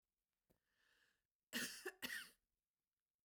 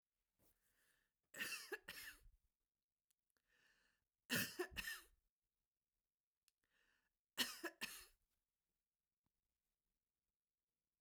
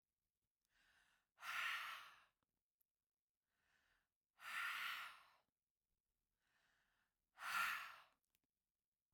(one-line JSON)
{"cough_length": "3.2 s", "cough_amplitude": 887, "cough_signal_mean_std_ratio": 0.33, "three_cough_length": "11.0 s", "three_cough_amplitude": 1327, "three_cough_signal_mean_std_ratio": 0.27, "exhalation_length": "9.1 s", "exhalation_amplitude": 856, "exhalation_signal_mean_std_ratio": 0.37, "survey_phase": "beta (2021-08-13 to 2022-03-07)", "age": "65+", "gender": "Female", "wearing_mask": "No", "symptom_none": true, "smoker_status": "Never smoked", "respiratory_condition_asthma": false, "respiratory_condition_other": false, "recruitment_source": "REACT", "submission_delay": "3 days", "covid_test_result": "Negative", "covid_test_method": "RT-qPCR", "influenza_a_test_result": "Negative", "influenza_b_test_result": "Negative"}